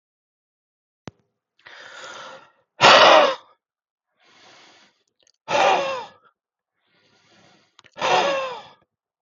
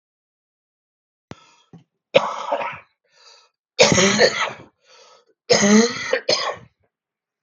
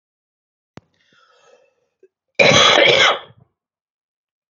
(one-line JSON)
{"exhalation_length": "9.2 s", "exhalation_amplitude": 32768, "exhalation_signal_mean_std_ratio": 0.31, "three_cough_length": "7.4 s", "three_cough_amplitude": 32768, "three_cough_signal_mean_std_ratio": 0.39, "cough_length": "4.5 s", "cough_amplitude": 32768, "cough_signal_mean_std_ratio": 0.34, "survey_phase": "beta (2021-08-13 to 2022-03-07)", "age": "45-64", "gender": "Male", "wearing_mask": "No", "symptom_cough_any": true, "symptom_sore_throat": true, "symptom_onset": "4 days", "smoker_status": "Never smoked", "respiratory_condition_asthma": true, "respiratory_condition_other": false, "recruitment_source": "Test and Trace", "submission_delay": "2 days", "covid_test_result": "Negative", "covid_test_method": "RT-qPCR"}